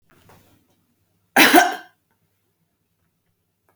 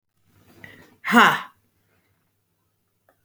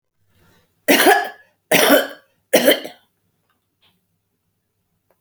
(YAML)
cough_length: 3.8 s
cough_amplitude: 32768
cough_signal_mean_std_ratio: 0.24
exhalation_length: 3.2 s
exhalation_amplitude: 28740
exhalation_signal_mean_std_ratio: 0.24
three_cough_length: 5.2 s
three_cough_amplitude: 32768
three_cough_signal_mean_std_ratio: 0.35
survey_phase: beta (2021-08-13 to 2022-03-07)
age: 45-64
gender: Female
wearing_mask: 'No'
symptom_none: true
smoker_status: Ex-smoker
respiratory_condition_asthma: false
respiratory_condition_other: false
recruitment_source: REACT
submission_delay: 1 day
covid_test_result: Negative
covid_test_method: RT-qPCR